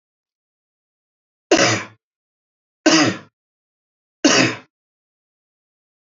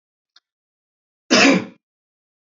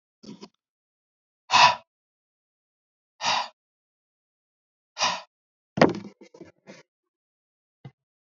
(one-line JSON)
{"three_cough_length": "6.1 s", "three_cough_amplitude": 28560, "three_cough_signal_mean_std_ratio": 0.3, "cough_length": "2.6 s", "cough_amplitude": 29017, "cough_signal_mean_std_ratio": 0.28, "exhalation_length": "8.3 s", "exhalation_amplitude": 27295, "exhalation_signal_mean_std_ratio": 0.22, "survey_phase": "beta (2021-08-13 to 2022-03-07)", "age": "45-64", "gender": "Male", "wearing_mask": "No", "symptom_none": true, "smoker_status": "Never smoked", "respiratory_condition_asthma": false, "respiratory_condition_other": false, "recruitment_source": "Test and Trace", "submission_delay": "1 day", "covid_test_result": "Positive", "covid_test_method": "RT-qPCR", "covid_ct_value": 19.8, "covid_ct_gene": "ORF1ab gene", "covid_ct_mean": 22.8, "covid_viral_load": "33000 copies/ml", "covid_viral_load_category": "Low viral load (10K-1M copies/ml)"}